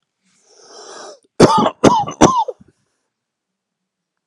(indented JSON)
{
  "cough_length": "4.3 s",
  "cough_amplitude": 32768,
  "cough_signal_mean_std_ratio": 0.34,
  "survey_phase": "alpha (2021-03-01 to 2021-08-12)",
  "age": "45-64",
  "gender": "Male",
  "wearing_mask": "No",
  "symptom_cough_any": true,
  "symptom_shortness_of_breath": true,
  "symptom_onset": "6 days",
  "smoker_status": "Current smoker (e-cigarettes or vapes only)",
  "respiratory_condition_asthma": false,
  "respiratory_condition_other": true,
  "recruitment_source": "Test and Trace",
  "submission_delay": "2 days",
  "covid_test_result": "Positive",
  "covid_test_method": "RT-qPCR",
  "covid_ct_value": 38.1,
  "covid_ct_gene": "N gene"
}